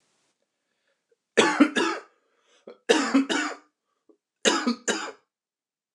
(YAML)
three_cough_length: 5.9 s
three_cough_amplitude: 20896
three_cough_signal_mean_std_ratio: 0.39
survey_phase: beta (2021-08-13 to 2022-03-07)
age: 18-44
gender: Male
wearing_mask: 'No'
symptom_none: true
smoker_status: Never smoked
respiratory_condition_asthma: false
respiratory_condition_other: false
recruitment_source: REACT
submission_delay: 1 day
covid_test_result: Negative
covid_test_method: RT-qPCR
influenza_a_test_result: Negative
influenza_b_test_result: Negative